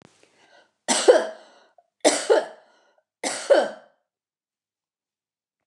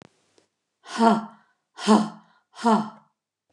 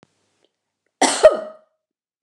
{"three_cough_length": "5.7 s", "three_cough_amplitude": 26129, "three_cough_signal_mean_std_ratio": 0.31, "exhalation_length": "3.5 s", "exhalation_amplitude": 20150, "exhalation_signal_mean_std_ratio": 0.37, "cough_length": "2.2 s", "cough_amplitude": 29204, "cough_signal_mean_std_ratio": 0.26, "survey_phase": "beta (2021-08-13 to 2022-03-07)", "age": "65+", "gender": "Female", "wearing_mask": "No", "symptom_cough_any": true, "symptom_shortness_of_breath": true, "symptom_fatigue": true, "symptom_onset": "12 days", "smoker_status": "Ex-smoker", "respiratory_condition_asthma": false, "respiratory_condition_other": false, "recruitment_source": "REACT", "submission_delay": "2 days", "covid_test_result": "Negative", "covid_test_method": "RT-qPCR", "influenza_a_test_result": "Negative", "influenza_b_test_result": "Negative"}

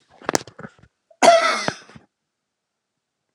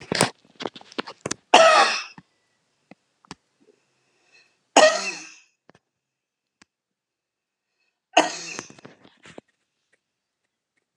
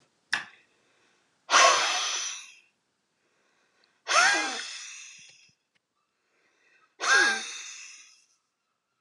{"cough_length": "3.3 s", "cough_amplitude": 32768, "cough_signal_mean_std_ratio": 0.29, "three_cough_length": "11.0 s", "three_cough_amplitude": 32768, "three_cough_signal_mean_std_ratio": 0.25, "exhalation_length": "9.0 s", "exhalation_amplitude": 16047, "exhalation_signal_mean_std_ratio": 0.37, "survey_phase": "alpha (2021-03-01 to 2021-08-12)", "age": "65+", "gender": "Female", "wearing_mask": "No", "symptom_shortness_of_breath": true, "symptom_onset": "12 days", "smoker_status": "Never smoked", "respiratory_condition_asthma": true, "respiratory_condition_other": false, "recruitment_source": "REACT", "submission_delay": "2 days", "covid_test_result": "Negative", "covid_test_method": "RT-qPCR"}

